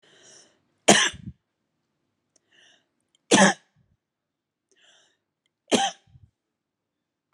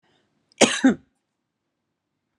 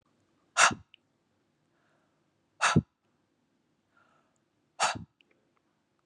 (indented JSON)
{
  "three_cough_length": "7.3 s",
  "three_cough_amplitude": 32537,
  "three_cough_signal_mean_std_ratio": 0.22,
  "cough_length": "2.4 s",
  "cough_amplitude": 31754,
  "cough_signal_mean_std_ratio": 0.24,
  "exhalation_length": "6.1 s",
  "exhalation_amplitude": 16567,
  "exhalation_signal_mean_std_ratio": 0.21,
  "survey_phase": "beta (2021-08-13 to 2022-03-07)",
  "age": "45-64",
  "gender": "Female",
  "wearing_mask": "No",
  "symptom_cough_any": true,
  "symptom_runny_or_blocked_nose": true,
  "smoker_status": "Never smoked",
  "respiratory_condition_asthma": true,
  "respiratory_condition_other": false,
  "recruitment_source": "REACT",
  "submission_delay": "1 day",
  "covid_test_result": "Negative",
  "covid_test_method": "RT-qPCR",
  "influenza_a_test_result": "Negative",
  "influenza_b_test_result": "Negative"
}